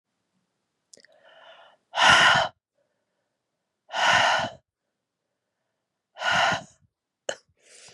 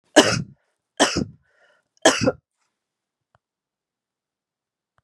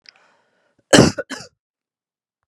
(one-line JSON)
{"exhalation_length": "7.9 s", "exhalation_amplitude": 22538, "exhalation_signal_mean_std_ratio": 0.34, "three_cough_length": "5.0 s", "three_cough_amplitude": 32767, "three_cough_signal_mean_std_ratio": 0.26, "cough_length": "2.5 s", "cough_amplitude": 32768, "cough_signal_mean_std_ratio": 0.23, "survey_phase": "beta (2021-08-13 to 2022-03-07)", "age": "45-64", "gender": "Female", "wearing_mask": "No", "symptom_cough_any": true, "symptom_runny_or_blocked_nose": true, "symptom_fatigue": true, "symptom_headache": true, "symptom_other": true, "symptom_onset": "3 days", "smoker_status": "Never smoked", "respiratory_condition_asthma": false, "respiratory_condition_other": false, "recruitment_source": "Test and Trace", "submission_delay": "1 day", "covid_test_result": "Negative", "covid_test_method": "RT-qPCR"}